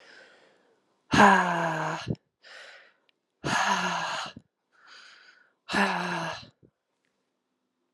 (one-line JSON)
{"exhalation_length": "7.9 s", "exhalation_amplitude": 20609, "exhalation_signal_mean_std_ratio": 0.4, "survey_phase": "beta (2021-08-13 to 2022-03-07)", "age": "45-64", "gender": "Female", "wearing_mask": "No", "symptom_cough_any": true, "symptom_runny_or_blocked_nose": true, "symptom_abdominal_pain": true, "symptom_fatigue": true, "symptom_headache": true, "symptom_other": true, "smoker_status": "Never smoked", "respiratory_condition_asthma": false, "respiratory_condition_other": false, "recruitment_source": "Test and Trace", "submission_delay": "2 days", "covid_test_result": "Positive", "covid_test_method": "RT-qPCR", "covid_ct_value": 29.3, "covid_ct_gene": "ORF1ab gene", "covid_ct_mean": 29.9, "covid_viral_load": "160 copies/ml", "covid_viral_load_category": "Minimal viral load (< 10K copies/ml)"}